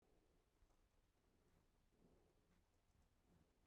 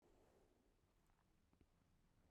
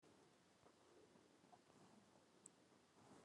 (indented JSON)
{
  "three_cough_length": "3.7 s",
  "three_cough_amplitude": 21,
  "three_cough_signal_mean_std_ratio": 1.05,
  "cough_length": "2.3 s",
  "cough_amplitude": 35,
  "cough_signal_mean_std_ratio": 1.05,
  "exhalation_length": "3.2 s",
  "exhalation_amplitude": 240,
  "exhalation_signal_mean_std_ratio": 1.0,
  "survey_phase": "beta (2021-08-13 to 2022-03-07)",
  "age": "18-44",
  "gender": "Female",
  "wearing_mask": "No",
  "symptom_none": true,
  "smoker_status": "Current smoker (11 or more cigarettes per day)",
  "respiratory_condition_asthma": false,
  "respiratory_condition_other": false,
  "recruitment_source": "REACT",
  "submission_delay": "3 days",
  "covid_test_result": "Negative",
  "covid_test_method": "RT-qPCR"
}